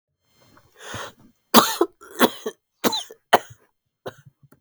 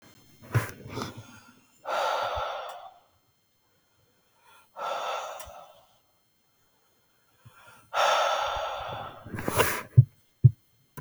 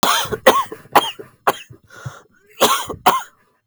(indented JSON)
{
  "three_cough_length": "4.6 s",
  "three_cough_amplitude": 32768,
  "three_cough_signal_mean_std_ratio": 0.27,
  "exhalation_length": "11.0 s",
  "exhalation_amplitude": 20156,
  "exhalation_signal_mean_std_ratio": 0.36,
  "cough_length": "3.7 s",
  "cough_amplitude": 32768,
  "cough_signal_mean_std_ratio": 0.44,
  "survey_phase": "beta (2021-08-13 to 2022-03-07)",
  "age": "18-44",
  "gender": "Male",
  "wearing_mask": "No",
  "symptom_cough_any": true,
  "symptom_runny_or_blocked_nose": true,
  "symptom_sore_throat": true,
  "symptom_headache": true,
  "smoker_status": "Never smoked",
  "respiratory_condition_asthma": false,
  "respiratory_condition_other": false,
  "recruitment_source": "Test and Trace",
  "submission_delay": "3 days",
  "covid_test_result": "Positive",
  "covid_test_method": "ePCR"
}